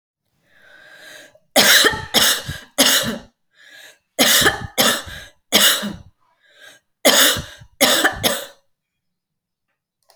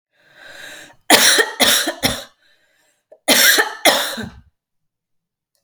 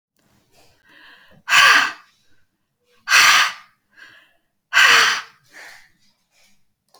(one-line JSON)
{"three_cough_length": "10.2 s", "three_cough_amplitude": 32768, "three_cough_signal_mean_std_ratio": 0.45, "cough_length": "5.6 s", "cough_amplitude": 32768, "cough_signal_mean_std_ratio": 0.43, "exhalation_length": "7.0 s", "exhalation_amplitude": 32124, "exhalation_signal_mean_std_ratio": 0.36, "survey_phase": "alpha (2021-03-01 to 2021-08-12)", "age": "45-64", "gender": "Female", "wearing_mask": "No", "symptom_fatigue": true, "symptom_onset": "12 days", "smoker_status": "Ex-smoker", "respiratory_condition_asthma": false, "respiratory_condition_other": false, "recruitment_source": "REACT", "submission_delay": "9 days", "covid_test_result": "Negative", "covid_test_method": "RT-qPCR"}